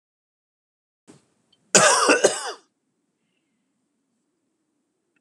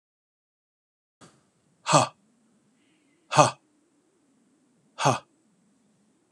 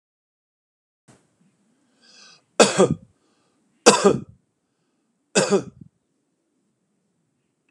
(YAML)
cough_length: 5.2 s
cough_amplitude: 32531
cough_signal_mean_std_ratio: 0.27
exhalation_length: 6.3 s
exhalation_amplitude: 31648
exhalation_signal_mean_std_ratio: 0.21
three_cough_length: 7.7 s
three_cough_amplitude: 32768
three_cough_signal_mean_std_ratio: 0.24
survey_phase: beta (2021-08-13 to 2022-03-07)
age: 45-64
gender: Male
wearing_mask: 'No'
symptom_runny_or_blocked_nose: true
symptom_sore_throat: true
symptom_fatigue: true
symptom_fever_high_temperature: true
symptom_headache: true
symptom_change_to_sense_of_smell_or_taste: true
symptom_loss_of_taste: true
smoker_status: Never smoked
respiratory_condition_asthma: false
respiratory_condition_other: false
recruitment_source: Test and Trace
submission_delay: 2 days
covid_test_result: Positive
covid_test_method: RT-qPCR
covid_ct_value: 18.8
covid_ct_gene: ORF1ab gene